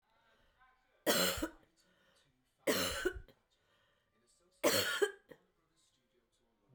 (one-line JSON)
{"three_cough_length": "6.7 s", "three_cough_amplitude": 4420, "three_cough_signal_mean_std_ratio": 0.36, "survey_phase": "beta (2021-08-13 to 2022-03-07)", "age": "45-64", "gender": "Female", "wearing_mask": "No", "symptom_new_continuous_cough": true, "symptom_runny_or_blocked_nose": true, "symptom_shortness_of_breath": true, "symptom_fatigue": true, "symptom_headache": true, "smoker_status": "Never smoked", "respiratory_condition_asthma": false, "respiratory_condition_other": false, "recruitment_source": "Test and Trace", "submission_delay": "1 day", "covid_test_result": "Positive", "covid_test_method": "RT-qPCR", "covid_ct_value": 20.0, "covid_ct_gene": "S gene", "covid_ct_mean": 20.8, "covid_viral_load": "150000 copies/ml", "covid_viral_load_category": "Low viral load (10K-1M copies/ml)"}